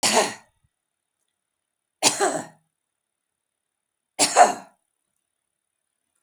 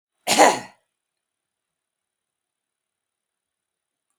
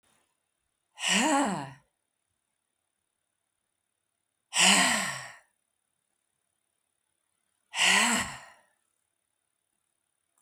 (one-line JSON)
{"three_cough_length": "6.2 s", "three_cough_amplitude": 29944, "three_cough_signal_mean_std_ratio": 0.27, "cough_length": "4.2 s", "cough_amplitude": 32406, "cough_signal_mean_std_ratio": 0.19, "exhalation_length": "10.4 s", "exhalation_amplitude": 13594, "exhalation_signal_mean_std_ratio": 0.33, "survey_phase": "beta (2021-08-13 to 2022-03-07)", "age": "65+", "gender": "Female", "wearing_mask": "No", "symptom_none": true, "smoker_status": "Never smoked", "respiratory_condition_asthma": false, "respiratory_condition_other": false, "recruitment_source": "REACT", "submission_delay": "1 day", "covid_test_result": "Negative", "covid_test_method": "RT-qPCR", "influenza_a_test_result": "Negative", "influenza_b_test_result": "Negative"}